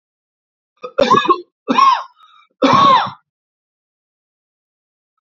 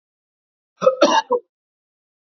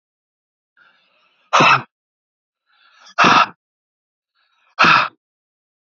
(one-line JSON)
{"three_cough_length": "5.2 s", "three_cough_amplitude": 30767, "three_cough_signal_mean_std_ratio": 0.39, "cough_length": "2.3 s", "cough_amplitude": 28089, "cough_signal_mean_std_ratio": 0.33, "exhalation_length": "6.0 s", "exhalation_amplitude": 32453, "exhalation_signal_mean_std_ratio": 0.3, "survey_phase": "beta (2021-08-13 to 2022-03-07)", "age": "45-64", "gender": "Male", "wearing_mask": "No", "symptom_none": true, "smoker_status": "Never smoked", "respiratory_condition_asthma": false, "respiratory_condition_other": false, "recruitment_source": "Test and Trace", "submission_delay": "1 day", "covid_test_result": "Negative", "covid_test_method": "LAMP"}